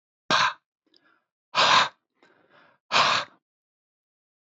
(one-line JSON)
{"exhalation_length": "4.5 s", "exhalation_amplitude": 16136, "exhalation_signal_mean_std_ratio": 0.35, "survey_phase": "beta (2021-08-13 to 2022-03-07)", "age": "45-64", "gender": "Male", "wearing_mask": "No", "symptom_none": true, "smoker_status": "Never smoked", "respiratory_condition_asthma": false, "respiratory_condition_other": false, "recruitment_source": "Test and Trace", "submission_delay": "0 days", "covid_test_result": "Negative", "covid_test_method": "LFT"}